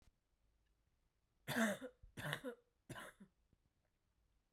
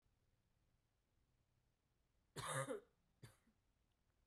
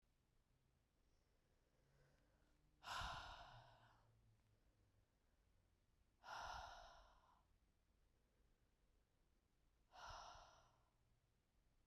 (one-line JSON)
{"three_cough_length": "4.5 s", "three_cough_amplitude": 1769, "three_cough_signal_mean_std_ratio": 0.32, "cough_length": "4.3 s", "cough_amplitude": 737, "cough_signal_mean_std_ratio": 0.29, "exhalation_length": "11.9 s", "exhalation_amplitude": 385, "exhalation_signal_mean_std_ratio": 0.42, "survey_phase": "beta (2021-08-13 to 2022-03-07)", "age": "18-44", "gender": "Female", "wearing_mask": "No", "symptom_cough_any": true, "symptom_runny_or_blocked_nose": true, "symptom_sore_throat": true, "symptom_fatigue": true, "symptom_headache": true, "symptom_change_to_sense_of_smell_or_taste": true, "symptom_loss_of_taste": true, "symptom_onset": "4 days", "smoker_status": "Never smoked", "respiratory_condition_asthma": false, "respiratory_condition_other": false, "recruitment_source": "Test and Trace", "submission_delay": "2 days", "covid_test_result": "Positive", "covid_test_method": "RT-qPCR", "covid_ct_value": 25.4, "covid_ct_gene": "N gene"}